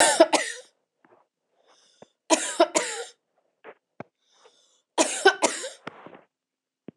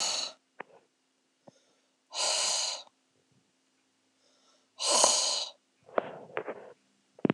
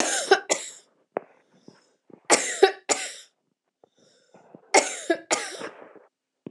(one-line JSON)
{"cough_length": "7.0 s", "cough_amplitude": 25035, "cough_signal_mean_std_ratio": 0.32, "exhalation_length": "7.3 s", "exhalation_amplitude": 13958, "exhalation_signal_mean_std_ratio": 0.39, "three_cough_length": "6.5 s", "three_cough_amplitude": 24641, "three_cough_signal_mean_std_ratio": 0.33, "survey_phase": "alpha (2021-03-01 to 2021-08-12)", "age": "45-64", "gender": "Female", "wearing_mask": "No", "symptom_none": true, "smoker_status": "Ex-smoker", "respiratory_condition_asthma": false, "respiratory_condition_other": false, "recruitment_source": "REACT", "submission_delay": "2 days", "covid_test_result": "Negative", "covid_test_method": "RT-qPCR"}